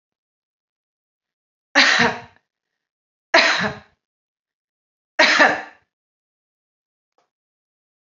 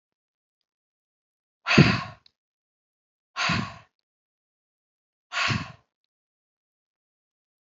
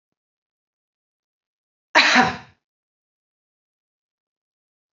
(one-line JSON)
{"three_cough_length": "8.1 s", "three_cough_amplitude": 30043, "three_cough_signal_mean_std_ratio": 0.29, "exhalation_length": "7.7 s", "exhalation_amplitude": 25098, "exhalation_signal_mean_std_ratio": 0.24, "cough_length": "4.9 s", "cough_amplitude": 28631, "cough_signal_mean_std_ratio": 0.21, "survey_phase": "alpha (2021-03-01 to 2021-08-12)", "age": "45-64", "gender": "Female", "wearing_mask": "No", "symptom_none": true, "smoker_status": "Never smoked", "respiratory_condition_asthma": false, "respiratory_condition_other": false, "recruitment_source": "REACT", "submission_delay": "1 day", "covid_test_result": "Negative", "covid_test_method": "RT-qPCR"}